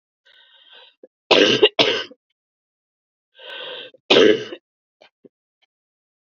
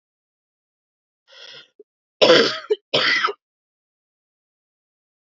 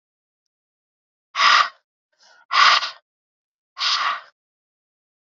{
  "three_cough_length": "6.2 s",
  "three_cough_amplitude": 32768,
  "three_cough_signal_mean_std_ratio": 0.31,
  "cough_length": "5.4 s",
  "cough_amplitude": 29371,
  "cough_signal_mean_std_ratio": 0.29,
  "exhalation_length": "5.3 s",
  "exhalation_amplitude": 28479,
  "exhalation_signal_mean_std_ratio": 0.34,
  "survey_phase": "beta (2021-08-13 to 2022-03-07)",
  "age": "18-44",
  "gender": "Female",
  "wearing_mask": "No",
  "symptom_cough_any": true,
  "symptom_runny_or_blocked_nose": true,
  "symptom_onset": "7 days",
  "smoker_status": "Current smoker (1 to 10 cigarettes per day)",
  "respiratory_condition_asthma": false,
  "respiratory_condition_other": false,
  "recruitment_source": "REACT",
  "submission_delay": "2 days",
  "covid_test_result": "Negative",
  "covid_test_method": "RT-qPCR",
  "influenza_a_test_result": "Negative",
  "influenza_b_test_result": "Negative"
}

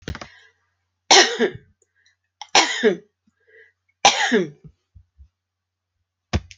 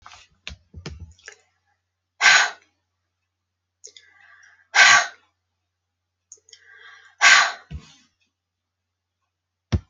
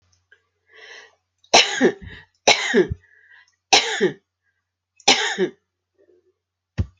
{
  "three_cough_length": "6.6 s",
  "three_cough_amplitude": 32767,
  "three_cough_signal_mean_std_ratio": 0.32,
  "exhalation_length": "9.9 s",
  "exhalation_amplitude": 30917,
  "exhalation_signal_mean_std_ratio": 0.26,
  "cough_length": "7.0 s",
  "cough_amplitude": 32768,
  "cough_signal_mean_std_ratio": 0.35,
  "survey_phase": "alpha (2021-03-01 to 2021-08-12)",
  "age": "65+",
  "gender": "Female",
  "wearing_mask": "No",
  "symptom_none": true,
  "smoker_status": "Ex-smoker",
  "respiratory_condition_asthma": false,
  "respiratory_condition_other": false,
  "recruitment_source": "REACT",
  "submission_delay": "3 days",
  "covid_test_result": "Negative",
  "covid_test_method": "RT-qPCR"
}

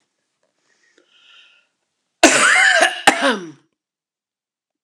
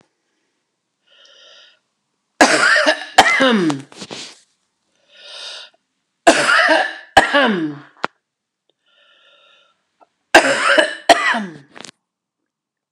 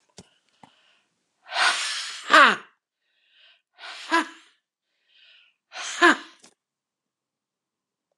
{
  "cough_length": "4.8 s",
  "cough_amplitude": 32768,
  "cough_signal_mean_std_ratio": 0.36,
  "three_cough_length": "12.9 s",
  "three_cough_amplitude": 32768,
  "three_cough_signal_mean_std_ratio": 0.4,
  "exhalation_length": "8.2 s",
  "exhalation_amplitude": 32682,
  "exhalation_signal_mean_std_ratio": 0.26,
  "survey_phase": "alpha (2021-03-01 to 2021-08-12)",
  "age": "45-64",
  "gender": "Female",
  "wearing_mask": "No",
  "symptom_headache": true,
  "smoker_status": "Never smoked",
  "respiratory_condition_asthma": false,
  "respiratory_condition_other": false,
  "recruitment_source": "REACT",
  "submission_delay": "1 day",
  "covid_test_result": "Negative",
  "covid_test_method": "RT-qPCR"
}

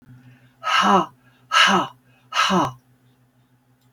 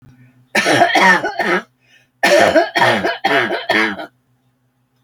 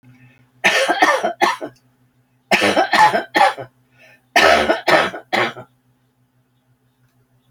{
  "exhalation_length": "3.9 s",
  "exhalation_amplitude": 24272,
  "exhalation_signal_mean_std_ratio": 0.46,
  "cough_length": "5.0 s",
  "cough_amplitude": 32579,
  "cough_signal_mean_std_ratio": 0.61,
  "three_cough_length": "7.5 s",
  "three_cough_amplitude": 32768,
  "three_cough_signal_mean_std_ratio": 0.48,
  "survey_phase": "alpha (2021-03-01 to 2021-08-12)",
  "age": "65+",
  "gender": "Female",
  "wearing_mask": "No",
  "symptom_none": true,
  "smoker_status": "Ex-smoker",
  "respiratory_condition_asthma": false,
  "respiratory_condition_other": false,
  "recruitment_source": "REACT",
  "submission_delay": "4 days",
  "covid_test_result": "Negative",
  "covid_test_method": "RT-qPCR"
}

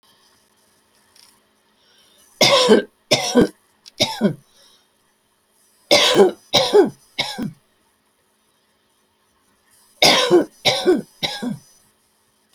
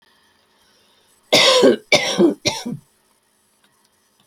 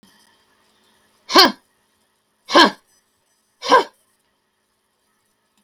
{
  "three_cough_length": "12.5 s",
  "three_cough_amplitude": 32768,
  "three_cough_signal_mean_std_ratio": 0.38,
  "cough_length": "4.3 s",
  "cough_amplitude": 32768,
  "cough_signal_mean_std_ratio": 0.39,
  "exhalation_length": "5.6 s",
  "exhalation_amplitude": 32019,
  "exhalation_signal_mean_std_ratio": 0.24,
  "survey_phase": "beta (2021-08-13 to 2022-03-07)",
  "age": "65+",
  "gender": "Female",
  "wearing_mask": "No",
  "symptom_cough_any": true,
  "symptom_shortness_of_breath": true,
  "smoker_status": "Never smoked",
  "respiratory_condition_asthma": true,
  "respiratory_condition_other": false,
  "recruitment_source": "REACT",
  "submission_delay": "2 days",
  "covid_test_result": "Negative",
  "covid_test_method": "RT-qPCR",
  "influenza_a_test_result": "Negative",
  "influenza_b_test_result": "Negative"
}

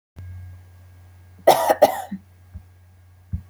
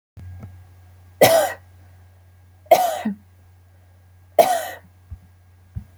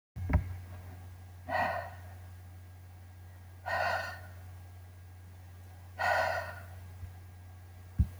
{
  "cough_length": "3.5 s",
  "cough_amplitude": 27996,
  "cough_signal_mean_std_ratio": 0.32,
  "three_cough_length": "6.0 s",
  "three_cough_amplitude": 32484,
  "three_cough_signal_mean_std_ratio": 0.34,
  "exhalation_length": "8.2 s",
  "exhalation_amplitude": 5137,
  "exhalation_signal_mean_std_ratio": 0.59,
  "survey_phase": "alpha (2021-03-01 to 2021-08-12)",
  "age": "18-44",
  "gender": "Female",
  "wearing_mask": "No",
  "symptom_none": true,
  "smoker_status": "Never smoked",
  "respiratory_condition_asthma": false,
  "respiratory_condition_other": false,
  "recruitment_source": "REACT",
  "submission_delay": "2 days",
  "covid_test_result": "Negative",
  "covid_test_method": "RT-qPCR"
}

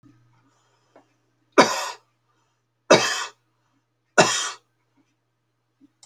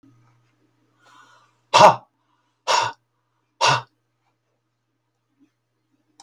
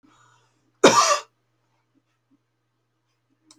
{
  "three_cough_length": "6.1 s",
  "three_cough_amplitude": 29754,
  "three_cough_signal_mean_std_ratio": 0.26,
  "exhalation_length": "6.2 s",
  "exhalation_amplitude": 30692,
  "exhalation_signal_mean_std_ratio": 0.23,
  "cough_length": "3.6 s",
  "cough_amplitude": 27743,
  "cough_signal_mean_std_ratio": 0.23,
  "survey_phase": "beta (2021-08-13 to 2022-03-07)",
  "age": "45-64",
  "gender": "Male",
  "wearing_mask": "No",
  "symptom_sore_throat": true,
  "smoker_status": "Never smoked",
  "respiratory_condition_asthma": false,
  "respiratory_condition_other": false,
  "recruitment_source": "REACT",
  "submission_delay": "4 days",
  "covid_test_result": "Negative",
  "covid_test_method": "RT-qPCR"
}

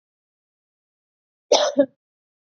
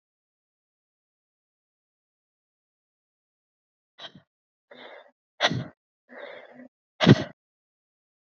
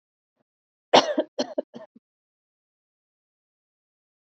{
  "cough_length": "2.5 s",
  "cough_amplitude": 26689,
  "cough_signal_mean_std_ratio": 0.25,
  "exhalation_length": "8.3 s",
  "exhalation_amplitude": 28552,
  "exhalation_signal_mean_std_ratio": 0.16,
  "three_cough_length": "4.3 s",
  "three_cough_amplitude": 25672,
  "three_cough_signal_mean_std_ratio": 0.19,
  "survey_phase": "beta (2021-08-13 to 2022-03-07)",
  "age": "18-44",
  "gender": "Female",
  "wearing_mask": "No",
  "symptom_cough_any": true,
  "symptom_headache": true,
  "smoker_status": "Never smoked",
  "respiratory_condition_asthma": false,
  "respiratory_condition_other": false,
  "recruitment_source": "Test and Trace",
  "submission_delay": "2 days",
  "covid_test_result": "Positive",
  "covid_test_method": "RT-qPCR",
  "covid_ct_value": 14.8,
  "covid_ct_gene": "ORF1ab gene"
}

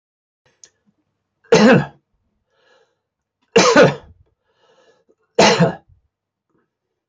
{
  "three_cough_length": "7.1 s",
  "three_cough_amplitude": 27779,
  "three_cough_signal_mean_std_ratio": 0.31,
  "survey_phase": "beta (2021-08-13 to 2022-03-07)",
  "age": "65+",
  "gender": "Male",
  "wearing_mask": "No",
  "symptom_none": true,
  "symptom_onset": "11 days",
  "smoker_status": "Ex-smoker",
  "respiratory_condition_asthma": false,
  "respiratory_condition_other": false,
  "recruitment_source": "REACT",
  "submission_delay": "3 days",
  "covid_test_result": "Negative",
  "covid_test_method": "RT-qPCR",
  "influenza_a_test_result": "Negative",
  "influenza_b_test_result": "Negative"
}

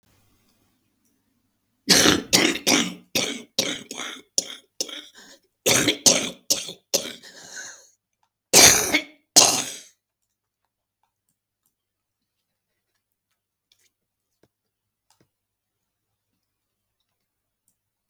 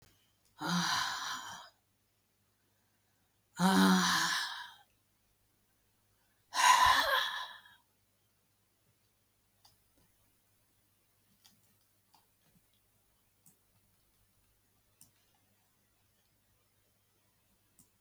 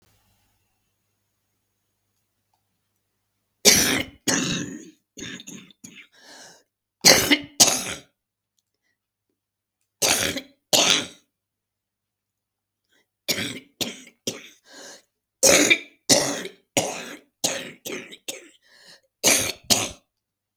{
  "cough_length": "18.1 s",
  "cough_amplitude": 32768,
  "cough_signal_mean_std_ratio": 0.28,
  "exhalation_length": "18.0 s",
  "exhalation_amplitude": 7641,
  "exhalation_signal_mean_std_ratio": 0.3,
  "three_cough_length": "20.6 s",
  "three_cough_amplitude": 32766,
  "three_cough_signal_mean_std_ratio": 0.33,
  "survey_phase": "beta (2021-08-13 to 2022-03-07)",
  "age": "65+",
  "gender": "Female",
  "wearing_mask": "No",
  "symptom_cough_any": true,
  "smoker_status": "Never smoked",
  "respiratory_condition_asthma": true,
  "respiratory_condition_other": true,
  "recruitment_source": "REACT",
  "submission_delay": "0 days",
  "covid_test_result": "Negative",
  "covid_test_method": "RT-qPCR"
}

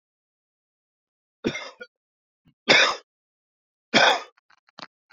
{
  "three_cough_length": "5.1 s",
  "three_cough_amplitude": 25141,
  "three_cough_signal_mean_std_ratio": 0.27,
  "survey_phase": "beta (2021-08-13 to 2022-03-07)",
  "age": "45-64",
  "gender": "Male",
  "wearing_mask": "No",
  "symptom_cough_any": true,
  "symptom_new_continuous_cough": true,
  "symptom_runny_or_blocked_nose": true,
  "symptom_shortness_of_breath": true,
  "symptom_headache": true,
  "symptom_change_to_sense_of_smell_or_taste": true,
  "symptom_onset": "3 days",
  "smoker_status": "Ex-smoker",
  "respiratory_condition_asthma": false,
  "respiratory_condition_other": false,
  "recruitment_source": "Test and Trace",
  "submission_delay": "2 days",
  "covid_test_result": "Positive",
  "covid_test_method": "RT-qPCR",
  "covid_ct_value": 14.9,
  "covid_ct_gene": "ORF1ab gene",
  "covid_ct_mean": 16.0,
  "covid_viral_load": "5700000 copies/ml",
  "covid_viral_load_category": "High viral load (>1M copies/ml)"
}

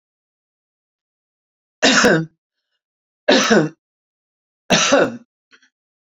{
  "three_cough_length": "6.1 s",
  "three_cough_amplitude": 32767,
  "three_cough_signal_mean_std_ratio": 0.36,
  "survey_phase": "beta (2021-08-13 to 2022-03-07)",
  "age": "45-64",
  "gender": "Female",
  "wearing_mask": "No",
  "symptom_none": true,
  "smoker_status": "Never smoked",
  "respiratory_condition_asthma": false,
  "respiratory_condition_other": true,
  "recruitment_source": "REACT",
  "submission_delay": "3 days",
  "covid_test_result": "Negative",
  "covid_test_method": "RT-qPCR",
  "influenza_a_test_result": "Negative",
  "influenza_b_test_result": "Negative"
}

